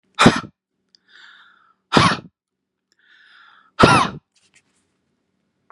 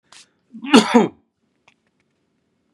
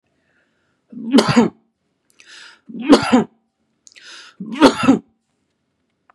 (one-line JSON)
{"exhalation_length": "5.7 s", "exhalation_amplitude": 32768, "exhalation_signal_mean_std_ratio": 0.27, "cough_length": "2.7 s", "cough_amplitude": 32768, "cough_signal_mean_std_ratio": 0.26, "three_cough_length": "6.1 s", "three_cough_amplitude": 32768, "three_cough_signal_mean_std_ratio": 0.33, "survey_phase": "beta (2021-08-13 to 2022-03-07)", "age": "45-64", "gender": "Male", "wearing_mask": "No", "symptom_runny_or_blocked_nose": true, "symptom_onset": "8 days", "smoker_status": "Never smoked", "respiratory_condition_asthma": false, "respiratory_condition_other": false, "recruitment_source": "REACT", "submission_delay": "2 days", "covid_test_result": "Negative", "covid_test_method": "RT-qPCR", "influenza_a_test_result": "Negative", "influenza_b_test_result": "Negative"}